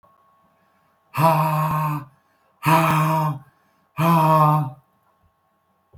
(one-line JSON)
{"exhalation_length": "6.0 s", "exhalation_amplitude": 22509, "exhalation_signal_mean_std_ratio": 0.54, "survey_phase": "beta (2021-08-13 to 2022-03-07)", "age": "65+", "gender": "Male", "wearing_mask": "No", "symptom_none": true, "smoker_status": "Never smoked", "respiratory_condition_asthma": false, "respiratory_condition_other": false, "recruitment_source": "REACT", "submission_delay": "2 days", "covid_test_result": "Negative", "covid_test_method": "RT-qPCR"}